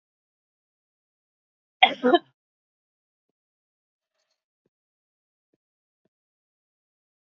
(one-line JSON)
{"cough_length": "7.3 s", "cough_amplitude": 28405, "cough_signal_mean_std_ratio": 0.12, "survey_phase": "beta (2021-08-13 to 2022-03-07)", "age": "45-64", "gender": "Female", "wearing_mask": "No", "symptom_cough_any": true, "smoker_status": "Never smoked", "respiratory_condition_asthma": false, "respiratory_condition_other": false, "recruitment_source": "REACT", "submission_delay": "1 day", "covid_test_result": "Negative", "covid_test_method": "RT-qPCR", "influenza_a_test_result": "Negative", "influenza_b_test_result": "Negative"}